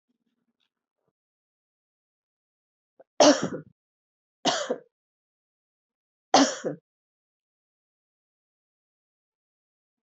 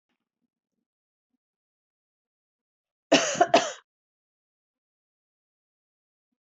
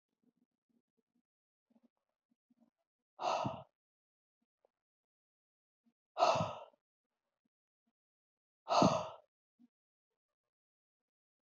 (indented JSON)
{
  "three_cough_length": "10.1 s",
  "three_cough_amplitude": 16775,
  "three_cough_signal_mean_std_ratio": 0.2,
  "cough_length": "6.5 s",
  "cough_amplitude": 17647,
  "cough_signal_mean_std_ratio": 0.19,
  "exhalation_length": "11.4 s",
  "exhalation_amplitude": 5404,
  "exhalation_signal_mean_std_ratio": 0.23,
  "survey_phase": "beta (2021-08-13 to 2022-03-07)",
  "age": "45-64",
  "gender": "Female",
  "wearing_mask": "No",
  "symptom_cough_any": true,
  "symptom_runny_or_blocked_nose": true,
  "symptom_change_to_sense_of_smell_or_taste": true,
  "symptom_onset": "4 days",
  "smoker_status": "Never smoked",
  "respiratory_condition_asthma": false,
  "respiratory_condition_other": false,
  "recruitment_source": "Test and Trace",
  "submission_delay": "2 days",
  "covid_test_result": "Positive",
  "covid_test_method": "RT-qPCR",
  "covid_ct_value": 11.7,
  "covid_ct_gene": "ORF1ab gene",
  "covid_ct_mean": 11.9,
  "covid_viral_load": "130000000 copies/ml",
  "covid_viral_load_category": "High viral load (>1M copies/ml)"
}